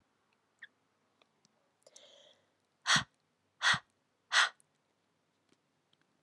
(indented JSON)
{
  "exhalation_length": "6.2 s",
  "exhalation_amplitude": 7528,
  "exhalation_signal_mean_std_ratio": 0.22,
  "survey_phase": "alpha (2021-03-01 to 2021-08-12)",
  "age": "18-44",
  "gender": "Female",
  "wearing_mask": "No",
  "symptom_headache": true,
  "symptom_change_to_sense_of_smell_or_taste": true,
  "symptom_loss_of_taste": true,
  "symptom_onset": "2 days",
  "smoker_status": "Never smoked",
  "respiratory_condition_asthma": false,
  "respiratory_condition_other": false,
  "recruitment_source": "Test and Trace",
  "submission_delay": "1 day",
  "covid_test_result": "Positive",
  "covid_test_method": "RT-qPCR",
  "covid_ct_value": 16.1,
  "covid_ct_gene": "N gene",
  "covid_ct_mean": 16.9,
  "covid_viral_load": "2800000 copies/ml",
  "covid_viral_load_category": "High viral load (>1M copies/ml)"
}